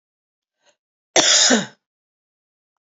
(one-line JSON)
{"cough_length": "2.8 s", "cough_amplitude": 28753, "cough_signal_mean_std_ratio": 0.33, "survey_phase": "beta (2021-08-13 to 2022-03-07)", "age": "45-64", "gender": "Female", "wearing_mask": "No", "symptom_new_continuous_cough": true, "symptom_runny_or_blocked_nose": true, "symptom_sore_throat": true, "symptom_fatigue": true, "symptom_change_to_sense_of_smell_or_taste": true, "symptom_onset": "2 days", "smoker_status": "Never smoked", "respiratory_condition_asthma": false, "respiratory_condition_other": false, "recruitment_source": "Test and Trace", "submission_delay": "1 day", "covid_test_result": "Positive", "covid_test_method": "RT-qPCR", "covid_ct_value": 19.8, "covid_ct_gene": "ORF1ab gene", "covid_ct_mean": 20.4, "covid_viral_load": "210000 copies/ml", "covid_viral_load_category": "Low viral load (10K-1M copies/ml)"}